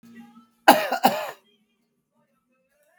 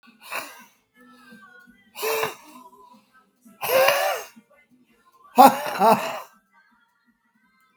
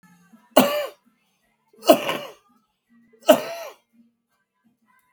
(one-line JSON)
{"cough_length": "3.0 s", "cough_amplitude": 32768, "cough_signal_mean_std_ratio": 0.26, "exhalation_length": "7.8 s", "exhalation_amplitude": 32768, "exhalation_signal_mean_std_ratio": 0.32, "three_cough_length": "5.1 s", "three_cough_amplitude": 32768, "three_cough_signal_mean_std_ratio": 0.26, "survey_phase": "beta (2021-08-13 to 2022-03-07)", "age": "65+", "gender": "Male", "wearing_mask": "No", "symptom_cough_any": true, "symptom_shortness_of_breath": true, "symptom_onset": "12 days", "smoker_status": "Ex-smoker", "respiratory_condition_asthma": true, "respiratory_condition_other": false, "recruitment_source": "REACT", "submission_delay": "4 days", "covid_test_result": "Negative", "covid_test_method": "RT-qPCR", "influenza_a_test_result": "Negative", "influenza_b_test_result": "Negative"}